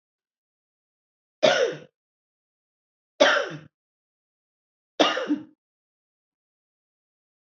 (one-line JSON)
{"three_cough_length": "7.6 s", "three_cough_amplitude": 22329, "three_cough_signal_mean_std_ratio": 0.26, "survey_phase": "alpha (2021-03-01 to 2021-08-12)", "age": "45-64", "gender": "Female", "wearing_mask": "No", "symptom_none": true, "smoker_status": "Never smoked", "respiratory_condition_asthma": false, "respiratory_condition_other": false, "recruitment_source": "REACT", "submission_delay": "1 day", "covid_test_result": "Negative", "covid_test_method": "RT-qPCR"}